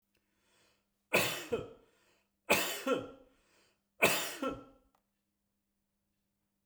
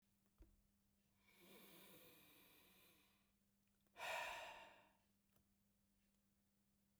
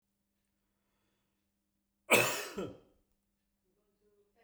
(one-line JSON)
{"three_cough_length": "6.7 s", "three_cough_amplitude": 7741, "three_cough_signal_mean_std_ratio": 0.34, "exhalation_length": "7.0 s", "exhalation_amplitude": 428, "exhalation_signal_mean_std_ratio": 0.38, "cough_length": "4.4 s", "cough_amplitude": 8784, "cough_signal_mean_std_ratio": 0.23, "survey_phase": "beta (2021-08-13 to 2022-03-07)", "age": "45-64", "gender": "Male", "wearing_mask": "No", "symptom_none": true, "smoker_status": "Ex-smoker", "respiratory_condition_asthma": false, "respiratory_condition_other": false, "recruitment_source": "REACT", "submission_delay": "2 days", "covid_test_result": "Negative", "covid_test_method": "RT-qPCR"}